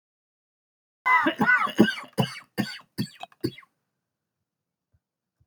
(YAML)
cough_length: 5.5 s
cough_amplitude: 20514
cough_signal_mean_std_ratio: 0.35
survey_phase: beta (2021-08-13 to 2022-03-07)
age: 45-64
gender: Male
wearing_mask: 'No'
symptom_none: true
smoker_status: Never smoked
respiratory_condition_asthma: false
respiratory_condition_other: false
recruitment_source: REACT
submission_delay: 3 days
covid_test_result: Negative
covid_test_method: RT-qPCR
influenza_a_test_result: Negative
influenza_b_test_result: Negative